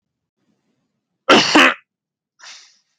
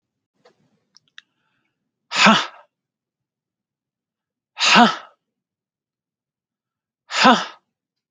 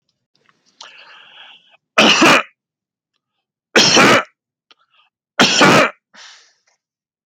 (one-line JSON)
{"cough_length": "3.0 s", "cough_amplitude": 32768, "cough_signal_mean_std_ratio": 0.29, "exhalation_length": "8.1 s", "exhalation_amplitude": 32768, "exhalation_signal_mean_std_ratio": 0.26, "three_cough_length": "7.3 s", "three_cough_amplitude": 32768, "three_cough_signal_mean_std_ratio": 0.37, "survey_phase": "beta (2021-08-13 to 2022-03-07)", "age": "45-64", "gender": "Male", "wearing_mask": "No", "symptom_none": true, "smoker_status": "Never smoked", "respiratory_condition_asthma": false, "respiratory_condition_other": false, "recruitment_source": "REACT", "submission_delay": "1 day", "covid_test_result": "Negative", "covid_test_method": "RT-qPCR", "influenza_a_test_result": "Negative", "influenza_b_test_result": "Negative"}